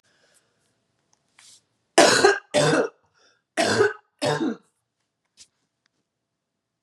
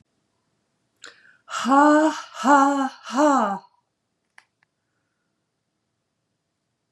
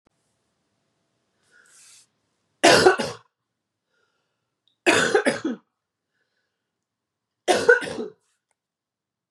cough_length: 6.8 s
cough_amplitude: 32307
cough_signal_mean_std_ratio: 0.35
exhalation_length: 6.9 s
exhalation_amplitude: 21690
exhalation_signal_mean_std_ratio: 0.39
three_cough_length: 9.3 s
three_cough_amplitude: 27547
three_cough_signal_mean_std_ratio: 0.28
survey_phase: beta (2021-08-13 to 2022-03-07)
age: 45-64
gender: Female
wearing_mask: 'No'
symptom_runny_or_blocked_nose: true
symptom_sore_throat: true
symptom_diarrhoea: true
symptom_headache: true
smoker_status: Never smoked
respiratory_condition_asthma: false
respiratory_condition_other: false
recruitment_source: Test and Trace
submission_delay: 1 day
covid_test_result: Positive
covid_test_method: RT-qPCR
covid_ct_value: 28.2
covid_ct_gene: ORF1ab gene
covid_ct_mean: 28.5
covid_viral_load: 450 copies/ml
covid_viral_load_category: Minimal viral load (< 10K copies/ml)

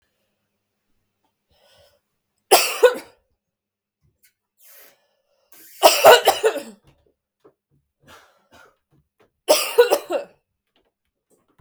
three_cough_length: 11.6 s
three_cough_amplitude: 32766
three_cough_signal_mean_std_ratio: 0.25
survey_phase: beta (2021-08-13 to 2022-03-07)
age: 45-64
gender: Female
wearing_mask: 'No'
symptom_cough_any: true
symptom_new_continuous_cough: true
symptom_runny_or_blocked_nose: true
symptom_shortness_of_breath: true
symptom_sore_throat: true
symptom_fatigue: true
symptom_headache: true
symptom_change_to_sense_of_smell_or_taste: true
symptom_onset: 5 days
smoker_status: Never smoked
respiratory_condition_asthma: true
respiratory_condition_other: false
recruitment_source: Test and Trace
submission_delay: 2 days
covid_test_result: Positive
covid_test_method: RT-qPCR
covid_ct_value: 24.3
covid_ct_gene: ORF1ab gene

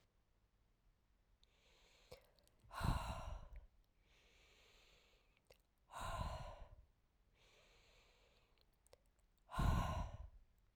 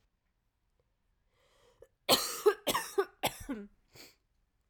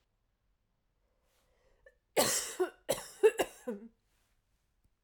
exhalation_length: 10.8 s
exhalation_amplitude: 1944
exhalation_signal_mean_std_ratio: 0.36
cough_length: 4.7 s
cough_amplitude: 10114
cough_signal_mean_std_ratio: 0.3
three_cough_length: 5.0 s
three_cough_amplitude: 7213
three_cough_signal_mean_std_ratio: 0.29
survey_phase: alpha (2021-03-01 to 2021-08-12)
age: 18-44
gender: Female
wearing_mask: 'No'
symptom_cough_any: true
symptom_fatigue: true
smoker_status: Never smoked
respiratory_condition_asthma: false
respiratory_condition_other: false
recruitment_source: Test and Trace
submission_delay: 1 day
covid_test_result: Positive
covid_test_method: RT-qPCR
covid_ct_value: 11.6
covid_ct_gene: S gene
covid_ct_mean: 12.7
covid_viral_load: 69000000 copies/ml
covid_viral_load_category: High viral load (>1M copies/ml)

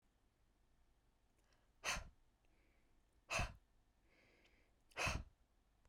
exhalation_length: 5.9 s
exhalation_amplitude: 1446
exhalation_signal_mean_std_ratio: 0.31
survey_phase: beta (2021-08-13 to 2022-03-07)
age: 18-44
gender: Female
wearing_mask: 'No'
symptom_none: true
symptom_onset: 11 days
smoker_status: Current smoker (1 to 10 cigarettes per day)
respiratory_condition_asthma: false
respiratory_condition_other: false
recruitment_source: REACT
submission_delay: 3 days
covid_test_result: Negative
covid_test_method: RT-qPCR
influenza_a_test_result: Unknown/Void
influenza_b_test_result: Unknown/Void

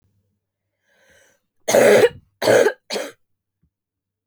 cough_length: 4.3 s
cough_amplitude: 27208
cough_signal_mean_std_ratio: 0.35
survey_phase: beta (2021-08-13 to 2022-03-07)
age: 18-44
gender: Female
wearing_mask: 'No'
symptom_cough_any: true
symptom_runny_or_blocked_nose: true
symptom_shortness_of_breath: true
symptom_sore_throat: true
symptom_fatigue: true
symptom_headache: true
symptom_other: true
smoker_status: Never smoked
respiratory_condition_asthma: false
respiratory_condition_other: false
recruitment_source: Test and Trace
submission_delay: 2 days
covid_test_result: Positive
covid_test_method: RT-qPCR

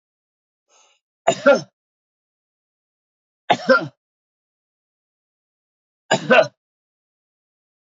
three_cough_length: 7.9 s
three_cough_amplitude: 28530
three_cough_signal_mean_std_ratio: 0.23
survey_phase: beta (2021-08-13 to 2022-03-07)
age: 45-64
gender: Male
wearing_mask: 'No'
symptom_none: true
smoker_status: Never smoked
respiratory_condition_asthma: false
respiratory_condition_other: false
recruitment_source: REACT
submission_delay: 1 day
covid_test_result: Negative
covid_test_method: RT-qPCR
influenza_a_test_result: Negative
influenza_b_test_result: Negative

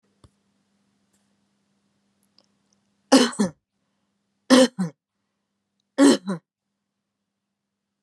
three_cough_length: 8.0 s
three_cough_amplitude: 28228
three_cough_signal_mean_std_ratio: 0.24
survey_phase: beta (2021-08-13 to 2022-03-07)
age: 45-64
gender: Female
wearing_mask: 'No'
symptom_none: true
smoker_status: Never smoked
respiratory_condition_asthma: true
respiratory_condition_other: false
recruitment_source: REACT
submission_delay: 3 days
covid_test_result: Negative
covid_test_method: RT-qPCR
influenza_a_test_result: Negative
influenza_b_test_result: Negative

